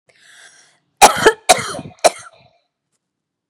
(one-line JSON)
{"cough_length": "3.5 s", "cough_amplitude": 32768, "cough_signal_mean_std_ratio": 0.28, "survey_phase": "beta (2021-08-13 to 2022-03-07)", "age": "18-44", "gender": "Female", "wearing_mask": "No", "symptom_none": true, "smoker_status": "Never smoked", "respiratory_condition_asthma": false, "respiratory_condition_other": false, "recruitment_source": "REACT", "submission_delay": "1 day", "covid_test_result": "Negative", "covid_test_method": "RT-qPCR", "influenza_a_test_result": "Negative", "influenza_b_test_result": "Negative"}